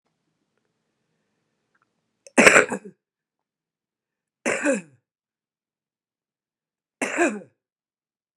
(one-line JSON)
{"three_cough_length": "8.4 s", "three_cough_amplitude": 32768, "three_cough_signal_mean_std_ratio": 0.22, "survey_phase": "beta (2021-08-13 to 2022-03-07)", "age": "65+", "gender": "Female", "wearing_mask": "No", "symptom_cough_any": true, "smoker_status": "Ex-smoker", "respiratory_condition_asthma": false, "respiratory_condition_other": false, "recruitment_source": "Test and Trace", "submission_delay": "1 day", "covid_test_result": "Negative", "covid_test_method": "RT-qPCR"}